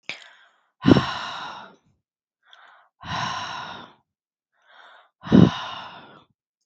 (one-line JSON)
{"exhalation_length": "6.7 s", "exhalation_amplitude": 32488, "exhalation_signal_mean_std_ratio": 0.28, "survey_phase": "beta (2021-08-13 to 2022-03-07)", "age": "18-44", "gender": "Female", "wearing_mask": "No", "symptom_cough_any": true, "symptom_runny_or_blocked_nose": true, "symptom_sore_throat": true, "symptom_onset": "5 days", "smoker_status": "Never smoked", "respiratory_condition_asthma": false, "respiratory_condition_other": false, "recruitment_source": "REACT", "submission_delay": "1 day", "covid_test_result": "Negative", "covid_test_method": "RT-qPCR", "influenza_a_test_result": "Unknown/Void", "influenza_b_test_result": "Unknown/Void"}